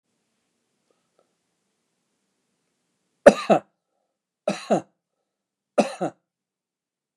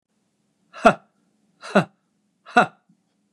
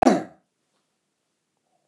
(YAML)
three_cough_length: 7.2 s
three_cough_amplitude: 29204
three_cough_signal_mean_std_ratio: 0.17
exhalation_length: 3.3 s
exhalation_amplitude: 29203
exhalation_signal_mean_std_ratio: 0.22
cough_length: 1.9 s
cough_amplitude: 28397
cough_signal_mean_std_ratio: 0.22
survey_phase: beta (2021-08-13 to 2022-03-07)
age: 65+
gender: Male
wearing_mask: 'No'
symptom_none: true
smoker_status: Ex-smoker
respiratory_condition_asthma: false
respiratory_condition_other: false
recruitment_source: REACT
submission_delay: 1 day
covid_test_result: Negative
covid_test_method: RT-qPCR
influenza_a_test_result: Negative
influenza_b_test_result: Negative